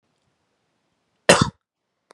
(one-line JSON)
{"cough_length": "2.1 s", "cough_amplitude": 32767, "cough_signal_mean_std_ratio": 0.2, "survey_phase": "beta (2021-08-13 to 2022-03-07)", "age": "18-44", "gender": "Male", "wearing_mask": "No", "symptom_none": true, "smoker_status": "Never smoked", "respiratory_condition_asthma": false, "respiratory_condition_other": false, "recruitment_source": "Test and Trace", "submission_delay": "1 day", "covid_test_result": "Positive", "covid_test_method": "RT-qPCR", "covid_ct_value": 23.2, "covid_ct_gene": "ORF1ab gene", "covid_ct_mean": 23.5, "covid_viral_load": "20000 copies/ml", "covid_viral_load_category": "Low viral load (10K-1M copies/ml)"}